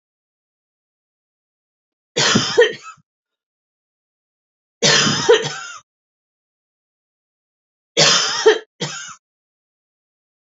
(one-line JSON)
{"three_cough_length": "10.4 s", "three_cough_amplitude": 31044, "three_cough_signal_mean_std_ratio": 0.33, "survey_phase": "alpha (2021-03-01 to 2021-08-12)", "age": "65+", "gender": "Female", "wearing_mask": "No", "symptom_cough_any": true, "symptom_headache": true, "symptom_onset": "12 days", "smoker_status": "Never smoked", "respiratory_condition_asthma": false, "respiratory_condition_other": false, "recruitment_source": "REACT", "submission_delay": "2 days", "covid_test_result": "Negative", "covid_test_method": "RT-qPCR"}